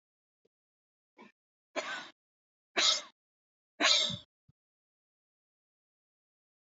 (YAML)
exhalation_length: 6.7 s
exhalation_amplitude: 8739
exhalation_signal_mean_std_ratio: 0.26
survey_phase: beta (2021-08-13 to 2022-03-07)
age: 45-64
gender: Male
wearing_mask: 'No'
symptom_none: true
smoker_status: Ex-smoker
respiratory_condition_asthma: false
respiratory_condition_other: true
recruitment_source: REACT
submission_delay: 1 day
covid_test_result: Negative
covid_test_method: RT-qPCR
influenza_a_test_result: Negative
influenza_b_test_result: Negative